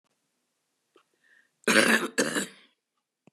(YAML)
cough_length: 3.3 s
cough_amplitude: 18335
cough_signal_mean_std_ratio: 0.33
survey_phase: beta (2021-08-13 to 2022-03-07)
age: 65+
gender: Female
wearing_mask: 'No'
symptom_none: true
smoker_status: Ex-smoker
respiratory_condition_asthma: false
respiratory_condition_other: false
recruitment_source: REACT
submission_delay: 5 days
covid_test_result: Negative
covid_test_method: RT-qPCR
influenza_a_test_result: Negative
influenza_b_test_result: Negative